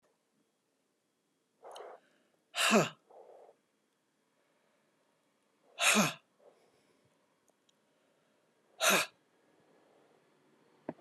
{"exhalation_length": "11.0 s", "exhalation_amplitude": 7085, "exhalation_signal_mean_std_ratio": 0.25, "survey_phase": "beta (2021-08-13 to 2022-03-07)", "age": "45-64", "gender": "Female", "wearing_mask": "No", "symptom_fatigue": true, "symptom_headache": true, "symptom_change_to_sense_of_smell_or_taste": true, "smoker_status": "Ex-smoker", "respiratory_condition_asthma": false, "respiratory_condition_other": false, "recruitment_source": "Test and Trace", "submission_delay": "1 day", "covid_test_result": "Positive", "covid_test_method": "RT-qPCR", "covid_ct_value": 16.0, "covid_ct_gene": "ORF1ab gene"}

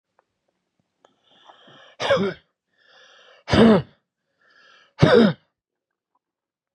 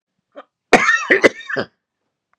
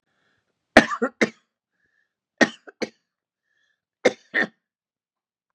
{"exhalation_length": "6.7 s", "exhalation_amplitude": 31348, "exhalation_signal_mean_std_ratio": 0.29, "cough_length": "2.4 s", "cough_amplitude": 32768, "cough_signal_mean_std_ratio": 0.37, "three_cough_length": "5.5 s", "three_cough_amplitude": 32768, "three_cough_signal_mean_std_ratio": 0.2, "survey_phase": "beta (2021-08-13 to 2022-03-07)", "age": "65+", "gender": "Male", "wearing_mask": "No", "symptom_none": true, "smoker_status": "Never smoked", "respiratory_condition_asthma": true, "respiratory_condition_other": false, "recruitment_source": "REACT", "submission_delay": "2 days", "covid_test_result": "Negative", "covid_test_method": "RT-qPCR", "influenza_a_test_result": "Negative", "influenza_b_test_result": "Negative"}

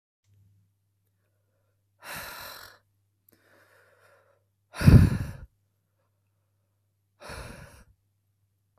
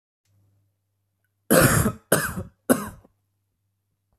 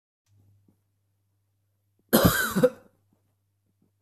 {"exhalation_length": "8.8 s", "exhalation_amplitude": 22756, "exhalation_signal_mean_std_ratio": 0.18, "three_cough_length": "4.2 s", "three_cough_amplitude": 29291, "three_cough_signal_mean_std_ratio": 0.33, "cough_length": "4.0 s", "cough_amplitude": 20875, "cough_signal_mean_std_ratio": 0.27, "survey_phase": "beta (2021-08-13 to 2022-03-07)", "age": "18-44", "gender": "Male", "wearing_mask": "No", "symptom_sore_throat": true, "symptom_diarrhoea": true, "symptom_fatigue": true, "symptom_headache": true, "symptom_onset": "4 days", "smoker_status": "Never smoked", "respiratory_condition_asthma": false, "respiratory_condition_other": false, "recruitment_source": "REACT", "submission_delay": "1 day", "covid_test_result": "Positive", "covid_test_method": "RT-qPCR", "covid_ct_value": 29.0, "covid_ct_gene": "E gene", "influenza_a_test_result": "Negative", "influenza_b_test_result": "Negative"}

